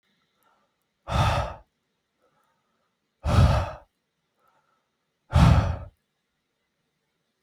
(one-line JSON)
{"exhalation_length": "7.4 s", "exhalation_amplitude": 19924, "exhalation_signal_mean_std_ratio": 0.32, "survey_phase": "beta (2021-08-13 to 2022-03-07)", "age": "18-44", "gender": "Male", "wearing_mask": "No", "symptom_none": true, "smoker_status": "Never smoked", "respiratory_condition_asthma": false, "respiratory_condition_other": false, "recruitment_source": "REACT", "submission_delay": "1 day", "covid_test_result": "Negative", "covid_test_method": "RT-qPCR", "influenza_a_test_result": "Negative", "influenza_b_test_result": "Negative"}